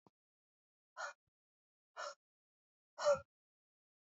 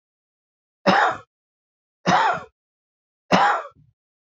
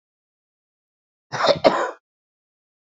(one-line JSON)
{"exhalation_length": "4.1 s", "exhalation_amplitude": 2623, "exhalation_signal_mean_std_ratio": 0.22, "three_cough_length": "4.3 s", "three_cough_amplitude": 26808, "three_cough_signal_mean_std_ratio": 0.38, "cough_length": "2.8 s", "cough_amplitude": 30439, "cough_signal_mean_std_ratio": 0.29, "survey_phase": "alpha (2021-03-01 to 2021-08-12)", "age": "45-64", "gender": "Male", "wearing_mask": "No", "symptom_cough_any": true, "symptom_new_continuous_cough": true, "symptom_shortness_of_breath": true, "symptom_fatigue": true, "symptom_fever_high_temperature": true, "symptom_headache": true, "symptom_change_to_sense_of_smell_or_taste": true, "symptom_loss_of_taste": true, "symptom_onset": "4 days", "smoker_status": "Never smoked", "respiratory_condition_asthma": false, "respiratory_condition_other": false, "recruitment_source": "Test and Trace", "submission_delay": "3 days", "covid_test_result": "Positive", "covid_test_method": "RT-qPCR", "covid_ct_value": 15.4, "covid_ct_gene": "ORF1ab gene", "covid_ct_mean": 15.8, "covid_viral_load": "6600000 copies/ml", "covid_viral_load_category": "High viral load (>1M copies/ml)"}